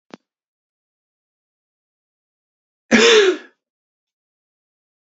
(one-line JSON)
{"cough_length": "5.0 s", "cough_amplitude": 29180, "cough_signal_mean_std_ratio": 0.24, "survey_phase": "beta (2021-08-13 to 2022-03-07)", "age": "18-44", "gender": "Male", "wearing_mask": "No", "symptom_new_continuous_cough": true, "symptom_sore_throat": true, "symptom_other": true, "symptom_onset": "4 days", "smoker_status": "Never smoked", "respiratory_condition_asthma": false, "respiratory_condition_other": false, "recruitment_source": "Test and Trace", "submission_delay": "1 day", "covid_test_result": "Positive", "covid_test_method": "RT-qPCR", "covid_ct_value": 26.4, "covid_ct_gene": "ORF1ab gene"}